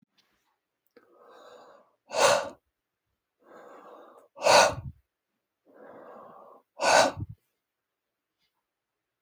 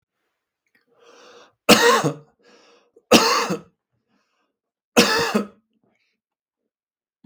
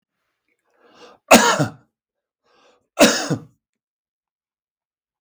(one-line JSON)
{"exhalation_length": "9.2 s", "exhalation_amplitude": 17227, "exhalation_signal_mean_std_ratio": 0.27, "three_cough_length": "7.3 s", "three_cough_amplitude": 32768, "three_cough_signal_mean_std_ratio": 0.32, "cough_length": "5.2 s", "cough_amplitude": 32768, "cough_signal_mean_std_ratio": 0.26, "survey_phase": "beta (2021-08-13 to 2022-03-07)", "age": "45-64", "gender": "Male", "wearing_mask": "No", "symptom_none": true, "smoker_status": "Ex-smoker", "respiratory_condition_asthma": false, "respiratory_condition_other": false, "recruitment_source": "REACT", "submission_delay": "1 day", "covid_test_result": "Negative", "covid_test_method": "RT-qPCR", "influenza_a_test_result": "Negative", "influenza_b_test_result": "Negative"}